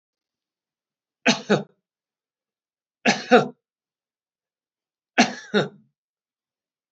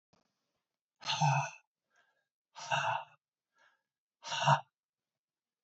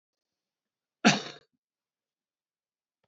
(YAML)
three_cough_length: 6.9 s
three_cough_amplitude: 27680
three_cough_signal_mean_std_ratio: 0.24
exhalation_length: 5.6 s
exhalation_amplitude: 6605
exhalation_signal_mean_std_ratio: 0.33
cough_length: 3.1 s
cough_amplitude: 14386
cough_signal_mean_std_ratio: 0.17
survey_phase: beta (2021-08-13 to 2022-03-07)
age: 65+
gender: Male
wearing_mask: 'No'
symptom_cough_any: true
smoker_status: Never smoked
respiratory_condition_asthma: false
respiratory_condition_other: false
recruitment_source: REACT
submission_delay: 1 day
covid_test_result: Negative
covid_test_method: RT-qPCR